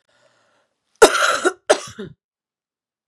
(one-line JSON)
{"three_cough_length": "3.1 s", "three_cough_amplitude": 32768, "three_cough_signal_mean_std_ratio": 0.29, "survey_phase": "beta (2021-08-13 to 2022-03-07)", "age": "18-44", "gender": "Female", "wearing_mask": "No", "symptom_cough_any": true, "symptom_runny_or_blocked_nose": true, "symptom_shortness_of_breath": true, "symptom_fatigue": true, "symptom_fever_high_temperature": true, "symptom_headache": true, "symptom_change_to_sense_of_smell_or_taste": true, "symptom_loss_of_taste": true, "symptom_other": true, "symptom_onset": "3 days", "smoker_status": "Ex-smoker", "respiratory_condition_asthma": false, "respiratory_condition_other": false, "recruitment_source": "Test and Trace", "submission_delay": "2 days", "covid_test_result": "Positive", "covid_test_method": "RT-qPCR", "covid_ct_value": 31.4, "covid_ct_gene": "ORF1ab gene"}